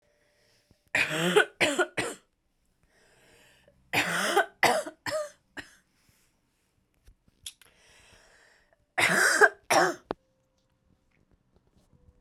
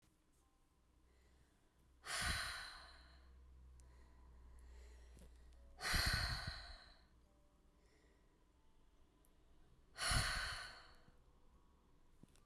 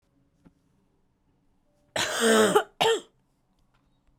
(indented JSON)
{
  "three_cough_length": "12.2 s",
  "three_cough_amplitude": 16593,
  "three_cough_signal_mean_std_ratio": 0.35,
  "exhalation_length": "12.5 s",
  "exhalation_amplitude": 1937,
  "exhalation_signal_mean_std_ratio": 0.42,
  "cough_length": "4.2 s",
  "cough_amplitude": 15074,
  "cough_signal_mean_std_ratio": 0.35,
  "survey_phase": "beta (2021-08-13 to 2022-03-07)",
  "age": "18-44",
  "gender": "Female",
  "wearing_mask": "No",
  "symptom_cough_any": true,
  "symptom_new_continuous_cough": true,
  "symptom_runny_or_blocked_nose": true,
  "symptom_shortness_of_breath": true,
  "symptom_sore_throat": true,
  "symptom_fatigue": true,
  "symptom_headache": true,
  "symptom_change_to_sense_of_smell_or_taste": true,
  "symptom_loss_of_taste": true,
  "smoker_status": "Never smoked",
  "respiratory_condition_asthma": false,
  "respiratory_condition_other": false,
  "recruitment_source": "Test and Trace",
  "submission_delay": "1 day",
  "covid_test_result": "Positive",
  "covid_test_method": "LFT"
}